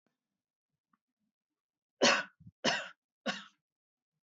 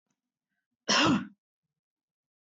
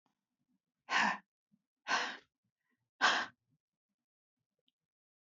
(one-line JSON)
{"three_cough_length": "4.4 s", "three_cough_amplitude": 7427, "three_cough_signal_mean_std_ratio": 0.25, "cough_length": "2.5 s", "cough_amplitude": 8282, "cough_signal_mean_std_ratio": 0.31, "exhalation_length": "5.2 s", "exhalation_amplitude": 4947, "exhalation_signal_mean_std_ratio": 0.29, "survey_phase": "beta (2021-08-13 to 2022-03-07)", "age": "45-64", "gender": "Female", "wearing_mask": "No", "symptom_none": true, "smoker_status": "Never smoked", "respiratory_condition_asthma": false, "respiratory_condition_other": false, "recruitment_source": "REACT", "submission_delay": "2 days", "covid_test_result": "Negative", "covid_test_method": "RT-qPCR"}